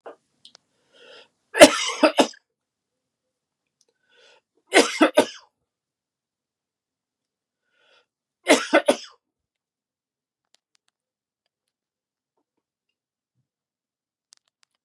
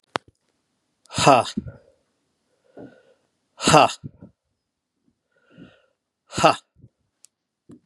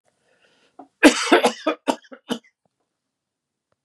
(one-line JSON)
{"three_cough_length": "14.8 s", "three_cough_amplitude": 32768, "three_cough_signal_mean_std_ratio": 0.19, "exhalation_length": "7.9 s", "exhalation_amplitude": 32767, "exhalation_signal_mean_std_ratio": 0.23, "cough_length": "3.8 s", "cough_amplitude": 32767, "cough_signal_mean_std_ratio": 0.28, "survey_phase": "beta (2021-08-13 to 2022-03-07)", "age": "65+", "gender": "Male", "wearing_mask": "No", "symptom_cough_any": true, "symptom_runny_or_blocked_nose": true, "symptom_fatigue": true, "smoker_status": "Never smoked", "respiratory_condition_asthma": false, "respiratory_condition_other": false, "recruitment_source": "Test and Trace", "submission_delay": "1 day", "covid_test_result": "Positive", "covid_test_method": "LFT"}